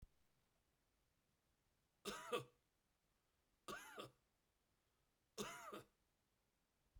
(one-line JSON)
{"three_cough_length": "7.0 s", "three_cough_amplitude": 830, "three_cough_signal_mean_std_ratio": 0.32, "survey_phase": "beta (2021-08-13 to 2022-03-07)", "age": "45-64", "gender": "Male", "wearing_mask": "No", "symptom_none": true, "symptom_onset": "4 days", "smoker_status": "Never smoked", "respiratory_condition_asthma": false, "respiratory_condition_other": false, "recruitment_source": "Test and Trace", "submission_delay": "1 day", "covid_test_result": "Positive", "covid_test_method": "RT-qPCR", "covid_ct_value": 18.0, "covid_ct_gene": "N gene"}